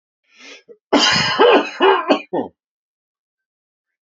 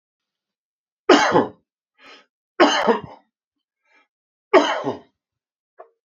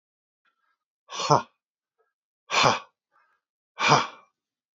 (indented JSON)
{
  "cough_length": "4.0 s",
  "cough_amplitude": 29745,
  "cough_signal_mean_std_ratio": 0.45,
  "three_cough_length": "6.1 s",
  "three_cough_amplitude": 30455,
  "three_cough_signal_mean_std_ratio": 0.32,
  "exhalation_length": "4.8 s",
  "exhalation_amplitude": 24456,
  "exhalation_signal_mean_std_ratio": 0.29,
  "survey_phase": "beta (2021-08-13 to 2022-03-07)",
  "age": "45-64",
  "gender": "Male",
  "wearing_mask": "No",
  "symptom_none": true,
  "smoker_status": "Current smoker (1 to 10 cigarettes per day)",
  "respiratory_condition_asthma": true,
  "respiratory_condition_other": false,
  "recruitment_source": "REACT",
  "submission_delay": "1 day",
  "covid_test_result": "Negative",
  "covid_test_method": "RT-qPCR",
  "influenza_a_test_result": "Negative",
  "influenza_b_test_result": "Negative"
}